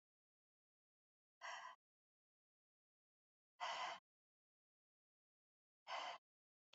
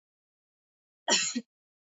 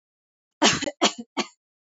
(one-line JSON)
{"exhalation_length": "6.7 s", "exhalation_amplitude": 598, "exhalation_signal_mean_std_ratio": 0.3, "cough_length": "1.9 s", "cough_amplitude": 8762, "cough_signal_mean_std_ratio": 0.3, "three_cough_length": "2.0 s", "three_cough_amplitude": 23213, "three_cough_signal_mean_std_ratio": 0.34, "survey_phase": "beta (2021-08-13 to 2022-03-07)", "age": "18-44", "gender": "Female", "wearing_mask": "No", "symptom_none": true, "smoker_status": "Never smoked", "respiratory_condition_asthma": false, "respiratory_condition_other": false, "recruitment_source": "REACT", "submission_delay": "1 day", "covid_test_result": "Negative", "covid_test_method": "RT-qPCR", "influenza_a_test_result": "Negative", "influenza_b_test_result": "Negative"}